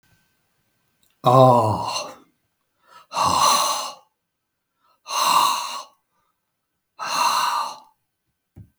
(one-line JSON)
{"exhalation_length": "8.8 s", "exhalation_amplitude": 31379, "exhalation_signal_mean_std_ratio": 0.44, "survey_phase": "beta (2021-08-13 to 2022-03-07)", "age": "65+", "gender": "Male", "wearing_mask": "No", "symptom_headache": true, "smoker_status": "Ex-smoker", "respiratory_condition_asthma": false, "respiratory_condition_other": false, "recruitment_source": "REACT", "submission_delay": "2 days", "covid_test_result": "Negative", "covid_test_method": "RT-qPCR", "influenza_a_test_result": "Negative", "influenza_b_test_result": "Negative"}